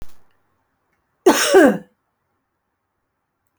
{"cough_length": "3.6 s", "cough_amplitude": 28883, "cough_signal_mean_std_ratio": 0.3, "survey_phase": "alpha (2021-03-01 to 2021-08-12)", "age": "65+", "gender": "Female", "wearing_mask": "No", "symptom_shortness_of_breath": true, "symptom_onset": "5 days", "smoker_status": "Ex-smoker", "respiratory_condition_asthma": false, "respiratory_condition_other": false, "recruitment_source": "REACT", "submission_delay": "1 day", "covid_test_result": "Negative", "covid_test_method": "RT-qPCR"}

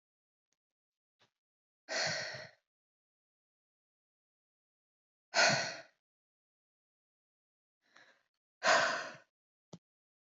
{"exhalation_length": "10.2 s", "exhalation_amplitude": 5922, "exhalation_signal_mean_std_ratio": 0.26, "survey_phase": "beta (2021-08-13 to 2022-03-07)", "age": "18-44", "gender": "Female", "wearing_mask": "No", "symptom_abdominal_pain": true, "smoker_status": "Never smoked", "respiratory_condition_asthma": false, "respiratory_condition_other": false, "recruitment_source": "REACT", "submission_delay": "1 day", "covid_test_result": "Negative", "covid_test_method": "RT-qPCR", "influenza_a_test_result": "Negative", "influenza_b_test_result": "Negative"}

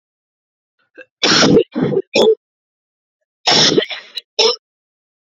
{"cough_length": "5.2 s", "cough_amplitude": 32768, "cough_signal_mean_std_ratio": 0.45, "survey_phase": "beta (2021-08-13 to 2022-03-07)", "age": "18-44", "gender": "Female", "wearing_mask": "No", "symptom_new_continuous_cough": true, "symptom_runny_or_blocked_nose": true, "symptom_shortness_of_breath": true, "symptom_diarrhoea": true, "symptom_fatigue": true, "symptom_fever_high_temperature": true, "symptom_headache": true, "symptom_change_to_sense_of_smell_or_taste": true, "symptom_loss_of_taste": true, "symptom_onset": "3 days", "smoker_status": "Ex-smoker", "respiratory_condition_asthma": false, "respiratory_condition_other": false, "recruitment_source": "Test and Trace", "submission_delay": "2 days", "covid_test_result": "Positive", "covid_test_method": "RT-qPCR", "covid_ct_value": 21.1, "covid_ct_gene": "ORF1ab gene"}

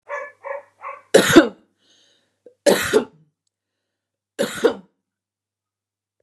{"three_cough_length": "6.2 s", "three_cough_amplitude": 32768, "three_cough_signal_mean_std_ratio": 0.29, "survey_phase": "beta (2021-08-13 to 2022-03-07)", "age": "45-64", "gender": "Female", "wearing_mask": "No", "symptom_cough_any": true, "symptom_runny_or_blocked_nose": true, "symptom_sore_throat": true, "symptom_fatigue": true, "smoker_status": "Never smoked", "respiratory_condition_asthma": false, "respiratory_condition_other": false, "recruitment_source": "Test and Trace", "submission_delay": "1 day", "covid_test_result": "Positive", "covid_test_method": "RT-qPCR", "covid_ct_value": 20.9, "covid_ct_gene": "ORF1ab gene", "covid_ct_mean": 21.4, "covid_viral_load": "96000 copies/ml", "covid_viral_load_category": "Low viral load (10K-1M copies/ml)"}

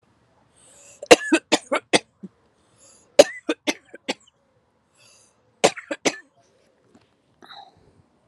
{"three_cough_length": "8.3 s", "three_cough_amplitude": 32768, "three_cough_signal_mean_std_ratio": 0.2, "survey_phase": "alpha (2021-03-01 to 2021-08-12)", "age": "18-44", "gender": "Female", "wearing_mask": "No", "symptom_none": true, "smoker_status": "Never smoked", "respiratory_condition_asthma": true, "respiratory_condition_other": false, "recruitment_source": "REACT", "submission_delay": "3 days", "covid_test_result": "Negative", "covid_test_method": "RT-qPCR"}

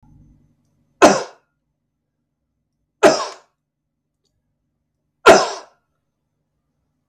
{"three_cough_length": "7.1 s", "three_cough_amplitude": 32768, "three_cough_signal_mean_std_ratio": 0.22, "survey_phase": "beta (2021-08-13 to 2022-03-07)", "age": "45-64", "gender": "Male", "wearing_mask": "No", "symptom_none": true, "symptom_onset": "11 days", "smoker_status": "Never smoked", "respiratory_condition_asthma": true, "respiratory_condition_other": false, "recruitment_source": "REACT", "submission_delay": "1 day", "covid_test_result": "Negative", "covid_test_method": "RT-qPCR"}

